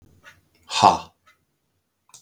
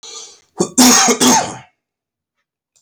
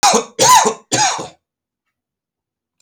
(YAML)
exhalation_length: 2.2 s
exhalation_amplitude: 32768
exhalation_signal_mean_std_ratio: 0.24
cough_length: 2.8 s
cough_amplitude: 32768
cough_signal_mean_std_ratio: 0.46
three_cough_length: 2.8 s
three_cough_amplitude: 30015
three_cough_signal_mean_std_ratio: 0.45
survey_phase: beta (2021-08-13 to 2022-03-07)
age: 18-44
gender: Male
wearing_mask: 'No'
symptom_none: true
smoker_status: Ex-smoker
respiratory_condition_asthma: false
respiratory_condition_other: false
recruitment_source: REACT
submission_delay: 0 days
covid_test_result: Negative
covid_test_method: RT-qPCR